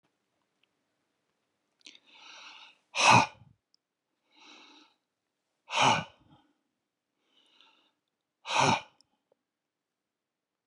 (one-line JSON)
{"exhalation_length": "10.7 s", "exhalation_amplitude": 14661, "exhalation_signal_mean_std_ratio": 0.23, "survey_phase": "beta (2021-08-13 to 2022-03-07)", "age": "65+", "gender": "Male", "wearing_mask": "No", "symptom_none": true, "smoker_status": "Ex-smoker", "respiratory_condition_asthma": false, "respiratory_condition_other": false, "recruitment_source": "REACT", "submission_delay": "1 day", "covid_test_result": "Negative", "covid_test_method": "RT-qPCR"}